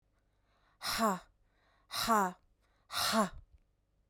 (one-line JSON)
{"exhalation_length": "4.1 s", "exhalation_amplitude": 4861, "exhalation_signal_mean_std_ratio": 0.42, "survey_phase": "beta (2021-08-13 to 2022-03-07)", "age": "18-44", "gender": "Female", "wearing_mask": "No", "symptom_none": true, "smoker_status": "Ex-smoker", "respiratory_condition_asthma": false, "respiratory_condition_other": false, "recruitment_source": "REACT", "submission_delay": "1 day", "covid_test_result": "Negative", "covid_test_method": "RT-qPCR"}